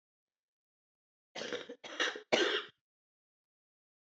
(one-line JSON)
{"cough_length": "4.0 s", "cough_amplitude": 7108, "cough_signal_mean_std_ratio": 0.32, "survey_phase": "beta (2021-08-13 to 2022-03-07)", "age": "45-64", "gender": "Female", "wearing_mask": "No", "symptom_cough_any": true, "symptom_new_continuous_cough": true, "symptom_runny_or_blocked_nose": true, "symptom_shortness_of_breath": true, "symptom_sore_throat": true, "symptom_fatigue": true, "symptom_fever_high_temperature": true, "symptom_headache": true, "symptom_change_to_sense_of_smell_or_taste": true, "symptom_loss_of_taste": true, "smoker_status": "Ex-smoker", "respiratory_condition_asthma": false, "respiratory_condition_other": false, "recruitment_source": "Test and Trace", "submission_delay": "1 day", "covid_test_result": "Positive", "covid_test_method": "RT-qPCR", "covid_ct_value": 16.5, "covid_ct_gene": "N gene"}